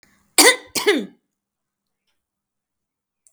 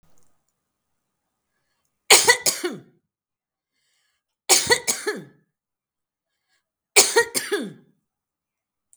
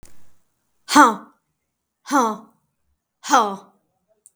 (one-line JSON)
{"cough_length": "3.3 s", "cough_amplitude": 32768, "cough_signal_mean_std_ratio": 0.26, "three_cough_length": "9.0 s", "three_cough_amplitude": 32768, "three_cough_signal_mean_std_ratio": 0.27, "exhalation_length": "4.4 s", "exhalation_amplitude": 32766, "exhalation_signal_mean_std_ratio": 0.31, "survey_phase": "beta (2021-08-13 to 2022-03-07)", "age": "65+", "gender": "Female", "wearing_mask": "No", "symptom_none": true, "smoker_status": "Never smoked", "respiratory_condition_asthma": false, "respiratory_condition_other": false, "recruitment_source": "REACT", "submission_delay": "3 days", "covid_test_result": "Negative", "covid_test_method": "RT-qPCR", "influenza_a_test_result": "Unknown/Void", "influenza_b_test_result": "Unknown/Void"}